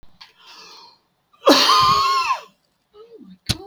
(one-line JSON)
{"cough_length": "3.7 s", "cough_amplitude": 28608, "cough_signal_mean_std_ratio": 0.45, "survey_phase": "beta (2021-08-13 to 2022-03-07)", "age": "65+", "gender": "Male", "wearing_mask": "No", "symptom_none": true, "smoker_status": "Ex-smoker", "respiratory_condition_asthma": false, "respiratory_condition_other": false, "recruitment_source": "REACT", "submission_delay": "2 days", "covid_test_result": "Negative", "covid_test_method": "RT-qPCR"}